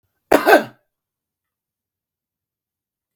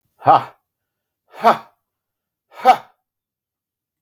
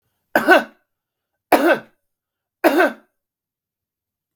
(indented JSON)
{
  "cough_length": "3.2 s",
  "cough_amplitude": 32768,
  "cough_signal_mean_std_ratio": 0.21,
  "exhalation_length": "4.0 s",
  "exhalation_amplitude": 32767,
  "exhalation_signal_mean_std_ratio": 0.24,
  "three_cough_length": "4.4 s",
  "three_cough_amplitude": 32768,
  "three_cough_signal_mean_std_ratio": 0.32,
  "survey_phase": "beta (2021-08-13 to 2022-03-07)",
  "age": "65+",
  "gender": "Male",
  "wearing_mask": "No",
  "symptom_none": true,
  "smoker_status": "Never smoked",
  "respiratory_condition_asthma": false,
  "respiratory_condition_other": false,
  "recruitment_source": "Test and Trace",
  "submission_delay": "1 day",
  "covid_test_result": "Negative",
  "covid_test_method": "ePCR"
}